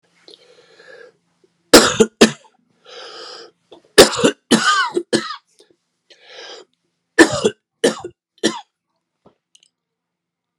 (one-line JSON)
{"three_cough_length": "10.6 s", "three_cough_amplitude": 32768, "three_cough_signal_mean_std_ratio": 0.29, "survey_phase": "beta (2021-08-13 to 2022-03-07)", "age": "45-64", "gender": "Male", "wearing_mask": "No", "symptom_cough_any": true, "symptom_new_continuous_cough": true, "symptom_runny_or_blocked_nose": true, "symptom_shortness_of_breath": true, "symptom_fatigue": true, "symptom_headache": true, "smoker_status": "Never smoked", "respiratory_condition_asthma": false, "respiratory_condition_other": false, "recruitment_source": "Test and Trace", "submission_delay": "0 days", "covid_test_result": "Positive", "covid_test_method": "LFT"}